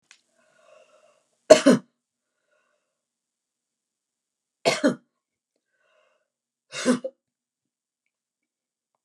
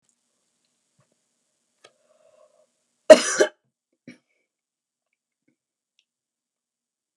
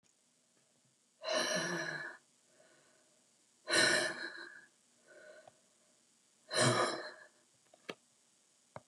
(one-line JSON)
{"three_cough_length": "9.0 s", "three_cough_amplitude": 32768, "three_cough_signal_mean_std_ratio": 0.18, "cough_length": "7.2 s", "cough_amplitude": 32768, "cough_signal_mean_std_ratio": 0.12, "exhalation_length": "8.9 s", "exhalation_amplitude": 5087, "exhalation_signal_mean_std_ratio": 0.39, "survey_phase": "beta (2021-08-13 to 2022-03-07)", "age": "65+", "gender": "Female", "wearing_mask": "No", "symptom_none": true, "smoker_status": "Ex-smoker", "respiratory_condition_asthma": false, "respiratory_condition_other": false, "recruitment_source": "REACT", "submission_delay": "2 days", "covid_test_result": "Negative", "covid_test_method": "RT-qPCR"}